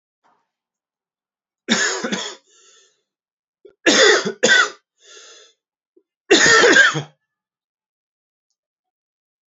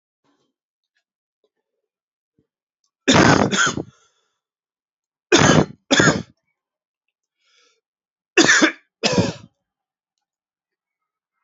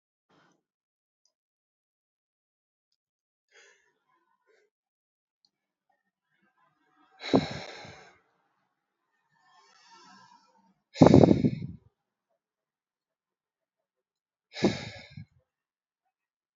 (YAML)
cough_length: 9.5 s
cough_amplitude: 30753
cough_signal_mean_std_ratio: 0.35
three_cough_length: 11.4 s
three_cough_amplitude: 32767
three_cough_signal_mean_std_ratio: 0.31
exhalation_length: 16.6 s
exhalation_amplitude: 26217
exhalation_signal_mean_std_ratio: 0.16
survey_phase: alpha (2021-03-01 to 2021-08-12)
age: 45-64
gender: Male
wearing_mask: 'No'
symptom_cough_any: true
symptom_fatigue: true
symptom_headache: true
smoker_status: Never smoked
respiratory_condition_asthma: false
respiratory_condition_other: false
recruitment_source: Test and Trace
submission_delay: 2 days
covid_test_result: Positive
covid_test_method: RT-qPCR
covid_ct_value: 12.2
covid_ct_gene: S gene
covid_ct_mean: 12.5
covid_viral_load: 78000000 copies/ml
covid_viral_load_category: High viral load (>1M copies/ml)